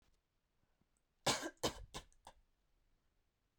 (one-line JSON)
{"cough_length": "3.6 s", "cough_amplitude": 2407, "cough_signal_mean_std_ratio": 0.26, "survey_phase": "beta (2021-08-13 to 2022-03-07)", "age": "18-44", "gender": "Female", "wearing_mask": "No", "symptom_abdominal_pain": true, "smoker_status": "Never smoked", "respiratory_condition_asthma": false, "respiratory_condition_other": false, "recruitment_source": "REACT", "submission_delay": "3 days", "covid_test_result": "Negative", "covid_test_method": "RT-qPCR"}